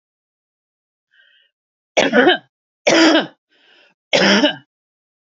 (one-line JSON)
{"three_cough_length": "5.2 s", "three_cough_amplitude": 30988, "three_cough_signal_mean_std_ratio": 0.39, "survey_phase": "beta (2021-08-13 to 2022-03-07)", "age": "45-64", "gender": "Female", "wearing_mask": "No", "symptom_cough_any": true, "smoker_status": "Never smoked", "respiratory_condition_asthma": false, "respiratory_condition_other": false, "recruitment_source": "REACT", "submission_delay": "1 day", "covid_test_result": "Negative", "covid_test_method": "RT-qPCR", "influenza_a_test_result": "Negative", "influenza_b_test_result": "Negative"}